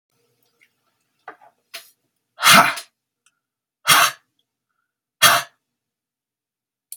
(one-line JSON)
{"exhalation_length": "7.0 s", "exhalation_amplitude": 32768, "exhalation_signal_mean_std_ratio": 0.26, "survey_phase": "beta (2021-08-13 to 2022-03-07)", "age": "45-64", "gender": "Male", "wearing_mask": "No", "symptom_none": true, "symptom_onset": "12 days", "smoker_status": "Never smoked", "respiratory_condition_asthma": false, "respiratory_condition_other": false, "recruitment_source": "REACT", "submission_delay": "1 day", "covid_test_result": "Negative", "covid_test_method": "RT-qPCR"}